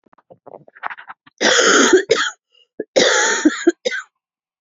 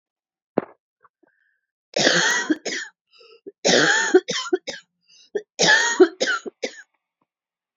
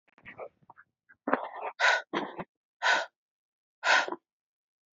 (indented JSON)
{
  "cough_length": "4.6 s",
  "cough_amplitude": 31889,
  "cough_signal_mean_std_ratio": 0.49,
  "three_cough_length": "7.8 s",
  "three_cough_amplitude": 25745,
  "three_cough_signal_mean_std_ratio": 0.42,
  "exhalation_length": "4.9 s",
  "exhalation_amplitude": 14202,
  "exhalation_signal_mean_std_ratio": 0.38,
  "survey_phase": "alpha (2021-03-01 to 2021-08-12)",
  "age": "18-44",
  "gender": "Female",
  "wearing_mask": "No",
  "symptom_cough_any": true,
  "symptom_abdominal_pain": true,
  "symptom_diarrhoea": true,
  "symptom_fatigue": true,
  "symptom_headache": true,
  "symptom_onset": "3 days",
  "smoker_status": "Ex-smoker",
  "respiratory_condition_asthma": true,
  "respiratory_condition_other": false,
  "recruitment_source": "Test and Trace",
  "submission_delay": "1 day",
  "covid_test_result": "Positive",
  "covid_test_method": "RT-qPCR",
  "covid_ct_value": 30.8,
  "covid_ct_gene": "N gene",
  "covid_ct_mean": 30.9,
  "covid_viral_load": "73 copies/ml",
  "covid_viral_load_category": "Minimal viral load (< 10K copies/ml)"
}